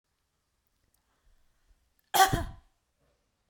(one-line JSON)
{"cough_length": "3.5 s", "cough_amplitude": 14787, "cough_signal_mean_std_ratio": 0.22, "survey_phase": "beta (2021-08-13 to 2022-03-07)", "age": "18-44", "gender": "Female", "wearing_mask": "No", "symptom_runny_or_blocked_nose": true, "smoker_status": "Never smoked", "respiratory_condition_asthma": false, "respiratory_condition_other": false, "recruitment_source": "REACT", "submission_delay": "2 days", "covid_test_result": "Negative", "covid_test_method": "RT-qPCR", "influenza_a_test_result": "Unknown/Void", "influenza_b_test_result": "Unknown/Void"}